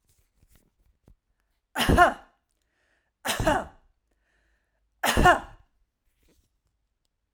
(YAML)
three_cough_length: 7.3 s
three_cough_amplitude: 19357
three_cough_signal_mean_std_ratio: 0.28
survey_phase: alpha (2021-03-01 to 2021-08-12)
age: 45-64
gender: Female
wearing_mask: 'No'
symptom_none: true
symptom_onset: 4 days
smoker_status: Ex-smoker
respiratory_condition_asthma: false
respiratory_condition_other: false
recruitment_source: REACT
submission_delay: 1 day
covid_test_result: Negative
covid_test_method: RT-qPCR